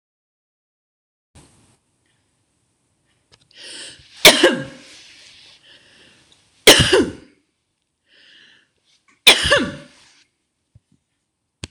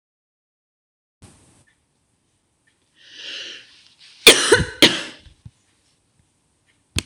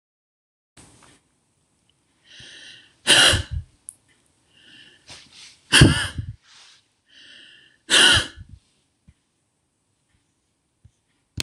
{"three_cough_length": "11.7 s", "three_cough_amplitude": 26028, "three_cough_signal_mean_std_ratio": 0.24, "cough_length": "7.1 s", "cough_amplitude": 26028, "cough_signal_mean_std_ratio": 0.22, "exhalation_length": "11.4 s", "exhalation_amplitude": 26027, "exhalation_signal_mean_std_ratio": 0.26, "survey_phase": "beta (2021-08-13 to 2022-03-07)", "age": "45-64", "gender": "Female", "wearing_mask": "No", "symptom_cough_any": true, "symptom_runny_or_blocked_nose": true, "symptom_change_to_sense_of_smell_or_taste": true, "symptom_loss_of_taste": true, "symptom_onset": "3 days", "smoker_status": "Never smoked", "respiratory_condition_asthma": false, "respiratory_condition_other": false, "recruitment_source": "Test and Trace", "submission_delay": "2 days", "covid_test_result": "Positive", "covid_test_method": "RT-qPCR", "covid_ct_value": 18.9, "covid_ct_gene": "ORF1ab gene"}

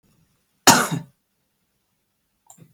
{"cough_length": "2.7 s", "cough_amplitude": 32766, "cough_signal_mean_std_ratio": 0.23, "survey_phase": "beta (2021-08-13 to 2022-03-07)", "age": "45-64", "gender": "Female", "wearing_mask": "No", "symptom_none": true, "smoker_status": "Never smoked", "respiratory_condition_asthma": false, "respiratory_condition_other": false, "recruitment_source": "Test and Trace", "submission_delay": "2 days", "covid_test_result": "Negative", "covid_test_method": "LFT"}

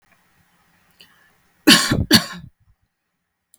{"cough_length": "3.6 s", "cough_amplitude": 32768, "cough_signal_mean_std_ratio": 0.28, "survey_phase": "beta (2021-08-13 to 2022-03-07)", "age": "18-44", "gender": "Female", "wearing_mask": "No", "symptom_runny_or_blocked_nose": true, "symptom_fatigue": true, "symptom_headache": true, "smoker_status": "Ex-smoker", "respiratory_condition_asthma": false, "respiratory_condition_other": false, "recruitment_source": "Test and Trace", "submission_delay": "1 day", "covid_test_result": "Positive", "covid_test_method": "RT-qPCR", "covid_ct_value": 27.3, "covid_ct_gene": "N gene"}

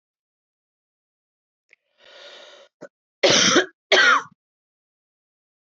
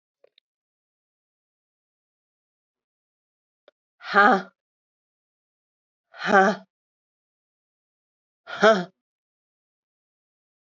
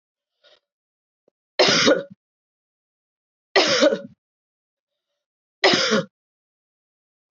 {"cough_length": "5.6 s", "cough_amplitude": 23382, "cough_signal_mean_std_ratio": 0.3, "exhalation_length": "10.8 s", "exhalation_amplitude": 21458, "exhalation_signal_mean_std_ratio": 0.21, "three_cough_length": "7.3 s", "three_cough_amplitude": 25532, "three_cough_signal_mean_std_ratio": 0.32, "survey_phase": "beta (2021-08-13 to 2022-03-07)", "age": "45-64", "gender": "Female", "wearing_mask": "No", "symptom_cough_any": true, "symptom_runny_or_blocked_nose": true, "symptom_fatigue": true, "symptom_fever_high_temperature": true, "symptom_headache": true, "symptom_other": true, "symptom_onset": "3 days", "smoker_status": "Ex-smoker", "respiratory_condition_asthma": false, "respiratory_condition_other": false, "recruitment_source": "Test and Trace", "submission_delay": "2 days", "covid_test_result": "Positive", "covid_test_method": "RT-qPCR"}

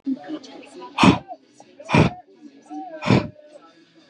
{"exhalation_length": "4.1 s", "exhalation_amplitude": 30113, "exhalation_signal_mean_std_ratio": 0.38, "survey_phase": "beta (2021-08-13 to 2022-03-07)", "age": "18-44", "gender": "Male", "wearing_mask": "No", "symptom_none": true, "smoker_status": "Current smoker (1 to 10 cigarettes per day)", "respiratory_condition_asthma": false, "respiratory_condition_other": false, "recruitment_source": "REACT", "submission_delay": "9 days", "covid_test_result": "Negative", "covid_test_method": "RT-qPCR", "influenza_a_test_result": "Negative", "influenza_b_test_result": "Negative"}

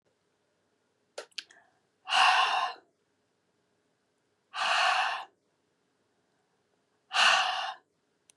{"exhalation_length": "8.4 s", "exhalation_amplitude": 12932, "exhalation_signal_mean_std_ratio": 0.38, "survey_phase": "beta (2021-08-13 to 2022-03-07)", "age": "45-64", "gender": "Female", "wearing_mask": "No", "symptom_none": true, "smoker_status": "Ex-smoker", "respiratory_condition_asthma": false, "respiratory_condition_other": false, "recruitment_source": "REACT", "submission_delay": "1 day", "covid_test_result": "Negative", "covid_test_method": "RT-qPCR", "influenza_a_test_result": "Negative", "influenza_b_test_result": "Negative"}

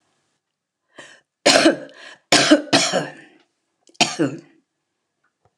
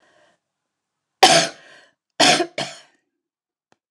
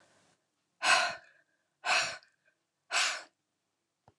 {"three_cough_length": "5.6 s", "three_cough_amplitude": 29204, "three_cough_signal_mean_std_ratio": 0.36, "cough_length": "3.9 s", "cough_amplitude": 29204, "cough_signal_mean_std_ratio": 0.29, "exhalation_length": "4.2 s", "exhalation_amplitude": 8013, "exhalation_signal_mean_std_ratio": 0.36, "survey_phase": "beta (2021-08-13 to 2022-03-07)", "age": "65+", "gender": "Female", "wearing_mask": "No", "symptom_none": true, "smoker_status": "Ex-smoker", "respiratory_condition_asthma": false, "respiratory_condition_other": false, "recruitment_source": "REACT", "submission_delay": "1 day", "covid_test_result": "Negative", "covid_test_method": "RT-qPCR", "influenza_a_test_result": "Unknown/Void", "influenza_b_test_result": "Unknown/Void"}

